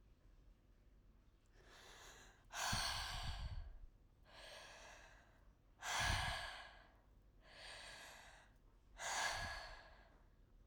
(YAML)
exhalation_length: 10.7 s
exhalation_amplitude: 1435
exhalation_signal_mean_std_ratio: 0.55
survey_phase: alpha (2021-03-01 to 2021-08-12)
age: 45-64
gender: Female
wearing_mask: 'No'
symptom_none: true
smoker_status: Ex-smoker
respiratory_condition_asthma: false
respiratory_condition_other: false
recruitment_source: REACT
submission_delay: 5 days
covid_test_method: RT-qPCR